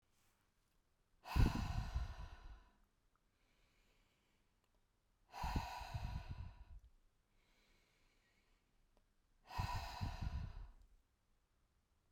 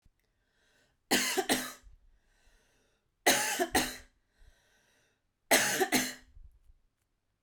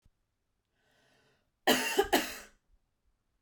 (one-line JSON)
{"exhalation_length": "12.1 s", "exhalation_amplitude": 2930, "exhalation_signal_mean_std_ratio": 0.37, "three_cough_length": "7.4 s", "three_cough_amplitude": 9691, "three_cough_signal_mean_std_ratio": 0.37, "cough_length": "3.4 s", "cough_amplitude": 8231, "cough_signal_mean_std_ratio": 0.3, "survey_phase": "beta (2021-08-13 to 2022-03-07)", "age": "45-64", "gender": "Female", "wearing_mask": "No", "symptom_none": true, "smoker_status": "Never smoked", "respiratory_condition_asthma": false, "respiratory_condition_other": false, "recruitment_source": "REACT", "submission_delay": "1 day", "covid_test_result": "Negative", "covid_test_method": "RT-qPCR"}